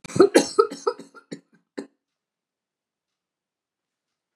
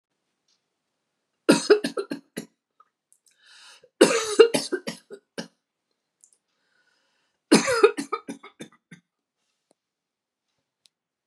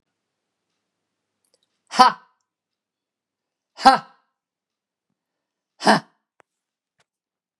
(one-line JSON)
{"cough_length": "4.4 s", "cough_amplitude": 29344, "cough_signal_mean_std_ratio": 0.22, "three_cough_length": "11.3 s", "three_cough_amplitude": 30359, "three_cough_signal_mean_std_ratio": 0.25, "exhalation_length": "7.6 s", "exhalation_amplitude": 32767, "exhalation_signal_mean_std_ratio": 0.17, "survey_phase": "beta (2021-08-13 to 2022-03-07)", "age": "45-64", "gender": "Female", "wearing_mask": "No", "symptom_none": true, "smoker_status": "Never smoked", "respiratory_condition_asthma": false, "respiratory_condition_other": false, "recruitment_source": "Test and Trace", "submission_delay": "2 days", "covid_test_result": "Negative", "covid_test_method": "RT-qPCR"}